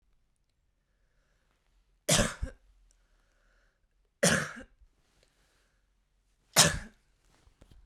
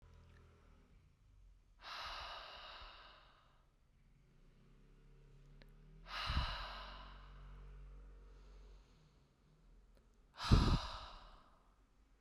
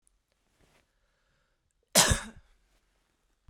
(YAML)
three_cough_length: 7.9 s
three_cough_amplitude: 15618
three_cough_signal_mean_std_ratio: 0.24
exhalation_length: 12.2 s
exhalation_amplitude: 5374
exhalation_signal_mean_std_ratio: 0.34
cough_length: 3.5 s
cough_amplitude: 19929
cough_signal_mean_std_ratio: 0.21
survey_phase: beta (2021-08-13 to 2022-03-07)
age: 18-44
gender: Female
wearing_mask: 'No'
symptom_fatigue: true
symptom_headache: true
symptom_onset: 6 days
smoker_status: Never smoked
respiratory_condition_asthma: false
respiratory_condition_other: false
recruitment_source: Test and Trace
submission_delay: 2 days
covid_test_result: Positive
covid_test_method: RT-qPCR
covid_ct_value: 29.6
covid_ct_gene: N gene